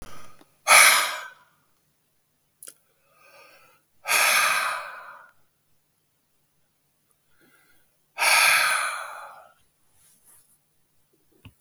exhalation_length: 11.6 s
exhalation_amplitude: 32766
exhalation_signal_mean_std_ratio: 0.34
survey_phase: beta (2021-08-13 to 2022-03-07)
age: 65+
gender: Male
wearing_mask: 'No'
symptom_new_continuous_cough: true
symptom_fatigue: true
symptom_onset: 3 days
smoker_status: Ex-smoker
respiratory_condition_asthma: false
respiratory_condition_other: false
recruitment_source: Test and Trace
submission_delay: 1 day
covid_test_result: Positive
covid_test_method: RT-qPCR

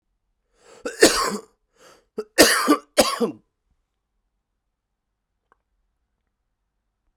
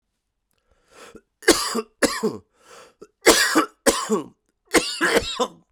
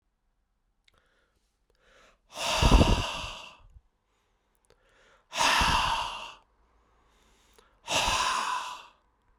cough_length: 7.2 s
cough_amplitude: 32768
cough_signal_mean_std_ratio: 0.27
three_cough_length: 5.7 s
three_cough_amplitude: 32767
three_cough_signal_mean_std_ratio: 0.43
exhalation_length: 9.4 s
exhalation_amplitude: 12263
exhalation_signal_mean_std_ratio: 0.4
survey_phase: beta (2021-08-13 to 2022-03-07)
age: 45-64
gender: Male
wearing_mask: 'Yes'
symptom_cough_any: true
symptom_new_continuous_cough: true
symptom_runny_or_blocked_nose: true
symptom_fever_high_temperature: true
symptom_headache: true
symptom_change_to_sense_of_smell_or_taste: true
symptom_loss_of_taste: true
symptom_other: true
symptom_onset: 2 days
smoker_status: Ex-smoker
respiratory_condition_asthma: false
respiratory_condition_other: false
recruitment_source: Test and Trace
submission_delay: 2 days
covid_test_result: Positive
covid_test_method: RT-qPCR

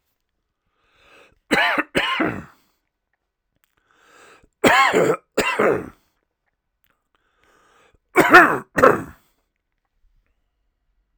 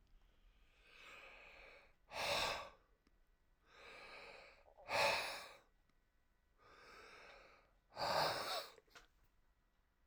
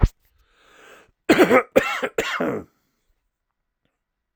three_cough_length: 11.2 s
three_cough_amplitude: 32768
three_cough_signal_mean_std_ratio: 0.33
exhalation_length: 10.1 s
exhalation_amplitude: 2013
exhalation_signal_mean_std_ratio: 0.41
cough_length: 4.4 s
cough_amplitude: 31870
cough_signal_mean_std_ratio: 0.34
survey_phase: alpha (2021-03-01 to 2021-08-12)
age: 65+
gender: Male
wearing_mask: 'No'
symptom_none: true
smoker_status: Never smoked
respiratory_condition_asthma: false
respiratory_condition_other: false
recruitment_source: REACT
submission_delay: 1 day
covid_test_result: Negative
covid_test_method: RT-qPCR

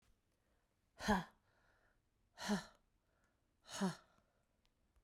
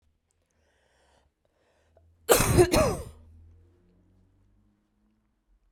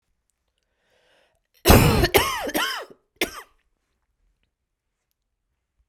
exhalation_length: 5.0 s
exhalation_amplitude: 2458
exhalation_signal_mean_std_ratio: 0.29
cough_length: 5.7 s
cough_amplitude: 20916
cough_signal_mean_std_ratio: 0.27
three_cough_length: 5.9 s
three_cough_amplitude: 32767
three_cough_signal_mean_std_ratio: 0.3
survey_phase: beta (2021-08-13 to 2022-03-07)
age: 18-44
gender: Female
wearing_mask: 'No'
symptom_cough_any: true
symptom_runny_or_blocked_nose: true
symptom_sore_throat: true
symptom_fatigue: true
symptom_headache: true
symptom_change_to_sense_of_smell_or_taste: true
symptom_onset: 12 days
smoker_status: Ex-smoker
respiratory_condition_asthma: false
respiratory_condition_other: false
recruitment_source: REACT
submission_delay: 2 days
covid_test_result: Negative
covid_test_method: RT-qPCR
influenza_a_test_result: Unknown/Void
influenza_b_test_result: Unknown/Void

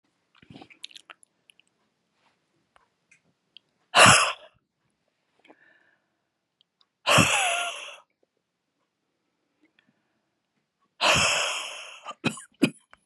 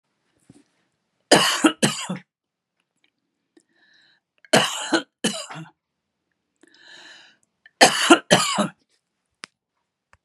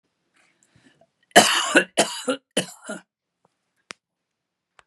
exhalation_length: 13.1 s
exhalation_amplitude: 28582
exhalation_signal_mean_std_ratio: 0.28
three_cough_length: 10.2 s
three_cough_amplitude: 32768
three_cough_signal_mean_std_ratio: 0.3
cough_length: 4.9 s
cough_amplitude: 32767
cough_signal_mean_std_ratio: 0.28
survey_phase: beta (2021-08-13 to 2022-03-07)
age: 65+
gender: Female
wearing_mask: 'No'
symptom_runny_or_blocked_nose: true
symptom_headache: true
symptom_onset: 12 days
smoker_status: Ex-smoker
respiratory_condition_asthma: false
respiratory_condition_other: true
recruitment_source: REACT
submission_delay: 1 day
covid_test_result: Negative
covid_test_method: RT-qPCR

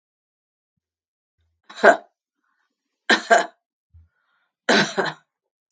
three_cough_length: 5.7 s
three_cough_amplitude: 32768
three_cough_signal_mean_std_ratio: 0.26
survey_phase: beta (2021-08-13 to 2022-03-07)
age: 65+
gender: Female
wearing_mask: 'No'
symptom_none: true
smoker_status: Never smoked
respiratory_condition_asthma: false
respiratory_condition_other: false
recruitment_source: REACT
submission_delay: 1 day
covid_test_result: Negative
covid_test_method: RT-qPCR
influenza_a_test_result: Negative
influenza_b_test_result: Negative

